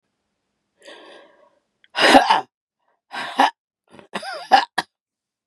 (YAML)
exhalation_length: 5.5 s
exhalation_amplitude: 32768
exhalation_signal_mean_std_ratio: 0.3
survey_phase: beta (2021-08-13 to 2022-03-07)
age: 45-64
gender: Female
wearing_mask: 'No'
symptom_cough_any: true
symptom_new_continuous_cough: true
symptom_runny_or_blocked_nose: true
symptom_sore_throat: true
symptom_fatigue: true
symptom_fever_high_temperature: true
symptom_headache: true
symptom_onset: 3 days
smoker_status: Never smoked
respiratory_condition_asthma: false
respiratory_condition_other: false
recruitment_source: Test and Trace
submission_delay: 2 days
covid_test_result: Positive
covid_test_method: RT-qPCR
covid_ct_value: 24.5
covid_ct_gene: ORF1ab gene
covid_ct_mean: 24.6
covid_viral_load: 8600 copies/ml
covid_viral_load_category: Minimal viral load (< 10K copies/ml)